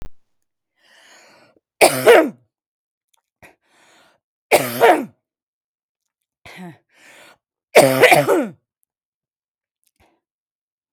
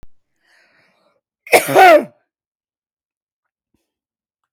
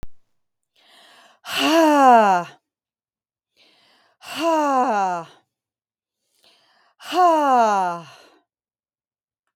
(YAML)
three_cough_length: 10.9 s
three_cough_amplitude: 32768
three_cough_signal_mean_std_ratio: 0.29
cough_length: 4.5 s
cough_amplitude: 32768
cough_signal_mean_std_ratio: 0.26
exhalation_length: 9.6 s
exhalation_amplitude: 28509
exhalation_signal_mean_std_ratio: 0.44
survey_phase: beta (2021-08-13 to 2022-03-07)
age: 45-64
gender: Female
wearing_mask: 'No'
symptom_none: true
smoker_status: Never smoked
respiratory_condition_asthma: false
respiratory_condition_other: false
recruitment_source: REACT
submission_delay: 1 day
covid_test_result: Negative
covid_test_method: RT-qPCR
influenza_a_test_result: Unknown/Void
influenza_b_test_result: Unknown/Void